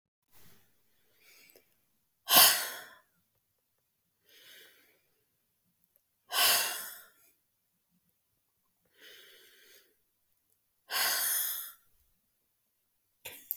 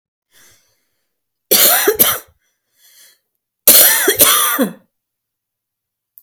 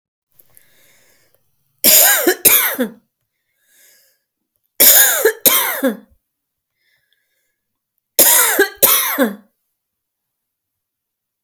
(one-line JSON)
{"exhalation_length": "13.6 s", "exhalation_amplitude": 16052, "exhalation_signal_mean_std_ratio": 0.26, "cough_length": "6.2 s", "cough_amplitude": 32768, "cough_signal_mean_std_ratio": 0.4, "three_cough_length": "11.4 s", "three_cough_amplitude": 32768, "three_cough_signal_mean_std_ratio": 0.39, "survey_phase": "alpha (2021-03-01 to 2021-08-12)", "age": "45-64", "gender": "Female", "wearing_mask": "No", "symptom_none": true, "smoker_status": "Never smoked", "respiratory_condition_asthma": false, "respiratory_condition_other": false, "recruitment_source": "REACT", "submission_delay": "5 days", "covid_test_result": "Negative", "covid_test_method": "RT-qPCR"}